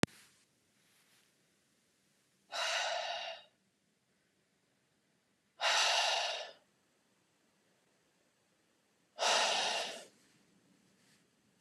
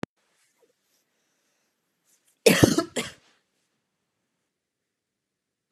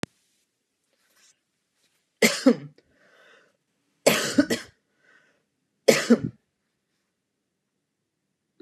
{
  "exhalation_length": "11.6 s",
  "exhalation_amplitude": 11928,
  "exhalation_signal_mean_std_ratio": 0.37,
  "cough_length": "5.7 s",
  "cough_amplitude": 26389,
  "cough_signal_mean_std_ratio": 0.19,
  "three_cough_length": "8.6 s",
  "three_cough_amplitude": 29109,
  "three_cough_signal_mean_std_ratio": 0.24,
  "survey_phase": "beta (2021-08-13 to 2022-03-07)",
  "age": "18-44",
  "gender": "Female",
  "wearing_mask": "No",
  "symptom_none": true,
  "smoker_status": "Never smoked",
  "respiratory_condition_asthma": false,
  "respiratory_condition_other": false,
  "recruitment_source": "REACT",
  "submission_delay": "2 days",
  "covid_test_result": "Negative",
  "covid_test_method": "RT-qPCR",
  "influenza_a_test_result": "Negative",
  "influenza_b_test_result": "Negative"
}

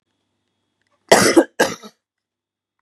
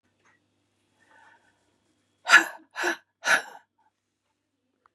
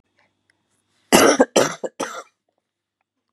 {
  "cough_length": "2.8 s",
  "cough_amplitude": 32768,
  "cough_signal_mean_std_ratio": 0.29,
  "exhalation_length": "4.9 s",
  "exhalation_amplitude": 26398,
  "exhalation_signal_mean_std_ratio": 0.22,
  "three_cough_length": "3.3 s",
  "three_cough_amplitude": 32768,
  "three_cough_signal_mean_std_ratio": 0.31,
  "survey_phase": "beta (2021-08-13 to 2022-03-07)",
  "age": "45-64",
  "gender": "Female",
  "wearing_mask": "No",
  "symptom_cough_any": true,
  "symptom_sore_throat": true,
  "symptom_onset": "3 days",
  "smoker_status": "Ex-smoker",
  "respiratory_condition_asthma": false,
  "respiratory_condition_other": false,
  "recruitment_source": "Test and Trace",
  "submission_delay": "1 day",
  "covid_test_result": "Negative",
  "covid_test_method": "RT-qPCR"
}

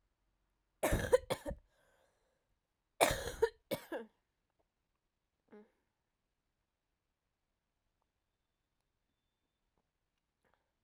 {
  "cough_length": "10.8 s",
  "cough_amplitude": 7326,
  "cough_signal_mean_std_ratio": 0.21,
  "survey_phase": "alpha (2021-03-01 to 2021-08-12)",
  "age": "18-44",
  "gender": "Female",
  "wearing_mask": "No",
  "symptom_cough_any": true,
  "symptom_shortness_of_breath": true,
  "symptom_diarrhoea": true,
  "symptom_fatigue": true,
  "symptom_onset": "7 days",
  "smoker_status": "Never smoked",
  "respiratory_condition_asthma": false,
  "respiratory_condition_other": false,
  "recruitment_source": "Test and Trace",
  "submission_delay": "1 day",
  "covid_test_result": "Positive",
  "covid_test_method": "RT-qPCR",
  "covid_ct_value": 24.0,
  "covid_ct_gene": "ORF1ab gene",
  "covid_ct_mean": 24.5,
  "covid_viral_load": "9200 copies/ml",
  "covid_viral_load_category": "Minimal viral load (< 10K copies/ml)"
}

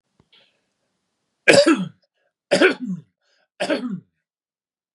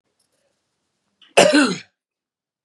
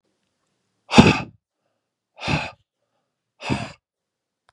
{
  "three_cough_length": "4.9 s",
  "three_cough_amplitude": 32768,
  "three_cough_signal_mean_std_ratio": 0.32,
  "cough_length": "2.6 s",
  "cough_amplitude": 32768,
  "cough_signal_mean_std_ratio": 0.29,
  "exhalation_length": "4.5 s",
  "exhalation_amplitude": 32768,
  "exhalation_signal_mean_std_ratio": 0.24,
  "survey_phase": "beta (2021-08-13 to 2022-03-07)",
  "age": "18-44",
  "gender": "Male",
  "wearing_mask": "No",
  "symptom_none": true,
  "smoker_status": "Ex-smoker",
  "respiratory_condition_asthma": false,
  "respiratory_condition_other": false,
  "recruitment_source": "REACT",
  "submission_delay": "2 days",
  "covid_test_result": "Negative",
  "covid_test_method": "RT-qPCR",
  "influenza_a_test_result": "Unknown/Void",
  "influenza_b_test_result": "Unknown/Void"
}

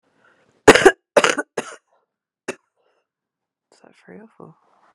{
  "three_cough_length": "4.9 s",
  "three_cough_amplitude": 32768,
  "three_cough_signal_mean_std_ratio": 0.21,
  "survey_phase": "beta (2021-08-13 to 2022-03-07)",
  "age": "18-44",
  "gender": "Female",
  "wearing_mask": "No",
  "symptom_cough_any": true,
  "symptom_new_continuous_cough": true,
  "symptom_runny_or_blocked_nose": true,
  "symptom_shortness_of_breath": true,
  "symptom_sore_throat": true,
  "symptom_fatigue": true,
  "symptom_onset": "5 days",
  "smoker_status": "Ex-smoker",
  "respiratory_condition_asthma": false,
  "respiratory_condition_other": false,
  "recruitment_source": "REACT",
  "submission_delay": "2 days",
  "covid_test_result": "Negative",
  "covid_test_method": "RT-qPCR",
  "influenza_a_test_result": "Negative",
  "influenza_b_test_result": "Negative"
}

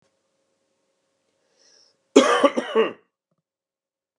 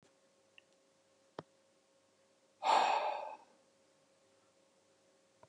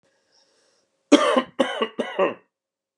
{
  "cough_length": "4.2 s",
  "cough_amplitude": 32081,
  "cough_signal_mean_std_ratio": 0.27,
  "exhalation_length": "5.5 s",
  "exhalation_amplitude": 3890,
  "exhalation_signal_mean_std_ratio": 0.29,
  "three_cough_length": "3.0 s",
  "three_cough_amplitude": 29380,
  "three_cough_signal_mean_std_ratio": 0.37,
  "survey_phase": "beta (2021-08-13 to 2022-03-07)",
  "age": "45-64",
  "gender": "Male",
  "wearing_mask": "No",
  "symptom_cough_any": true,
  "symptom_runny_or_blocked_nose": true,
  "symptom_headache": true,
  "smoker_status": "Never smoked",
  "respiratory_condition_asthma": false,
  "respiratory_condition_other": false,
  "recruitment_source": "Test and Trace",
  "submission_delay": "2 days",
  "covid_test_result": "Positive",
  "covid_test_method": "RT-qPCR",
  "covid_ct_value": 27.6,
  "covid_ct_gene": "ORF1ab gene",
  "covid_ct_mean": 28.4,
  "covid_viral_load": "470 copies/ml",
  "covid_viral_load_category": "Minimal viral load (< 10K copies/ml)"
}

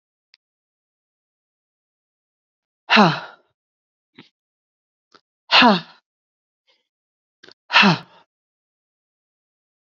{
  "exhalation_length": "9.9 s",
  "exhalation_amplitude": 30056,
  "exhalation_signal_mean_std_ratio": 0.22,
  "survey_phase": "beta (2021-08-13 to 2022-03-07)",
  "age": "45-64",
  "gender": "Female",
  "wearing_mask": "No",
  "symptom_runny_or_blocked_nose": true,
  "symptom_sore_throat": true,
  "symptom_fatigue": true,
  "symptom_onset": "2 days",
  "smoker_status": "Ex-smoker",
  "respiratory_condition_asthma": false,
  "respiratory_condition_other": false,
  "recruitment_source": "Test and Trace",
  "submission_delay": "1 day",
  "covid_test_result": "Positive",
  "covid_test_method": "RT-qPCR",
  "covid_ct_value": 22.1,
  "covid_ct_gene": "ORF1ab gene",
  "covid_ct_mean": 22.6,
  "covid_viral_load": "40000 copies/ml",
  "covid_viral_load_category": "Low viral load (10K-1M copies/ml)"
}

